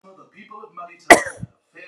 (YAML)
cough_length: 1.9 s
cough_amplitude: 32768
cough_signal_mean_std_ratio: 0.22
survey_phase: beta (2021-08-13 to 2022-03-07)
age: 18-44
gender: Female
wearing_mask: 'No'
symptom_runny_or_blocked_nose: true
smoker_status: Never smoked
respiratory_condition_asthma: false
respiratory_condition_other: false
recruitment_source: REACT
submission_delay: 2 days
covid_test_result: Negative
covid_test_method: RT-qPCR